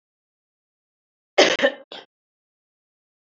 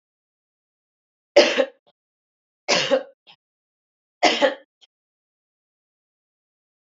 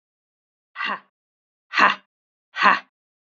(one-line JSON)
{"cough_length": "3.3 s", "cough_amplitude": 30330, "cough_signal_mean_std_ratio": 0.22, "three_cough_length": "6.8 s", "three_cough_amplitude": 29208, "three_cough_signal_mean_std_ratio": 0.26, "exhalation_length": "3.2 s", "exhalation_amplitude": 28280, "exhalation_signal_mean_std_ratio": 0.29, "survey_phase": "beta (2021-08-13 to 2022-03-07)", "age": "18-44", "gender": "Female", "wearing_mask": "No", "symptom_cough_any": true, "symptom_runny_or_blocked_nose": true, "symptom_sore_throat": true, "symptom_fatigue": true, "symptom_headache": true, "symptom_change_to_sense_of_smell_or_taste": true, "symptom_loss_of_taste": true, "symptom_onset": "4 days", "smoker_status": "Never smoked", "respiratory_condition_asthma": false, "respiratory_condition_other": false, "recruitment_source": "Test and Trace", "submission_delay": "2 days", "covid_test_result": "Positive", "covid_test_method": "RT-qPCR", "covid_ct_value": 24.6, "covid_ct_gene": "ORF1ab gene"}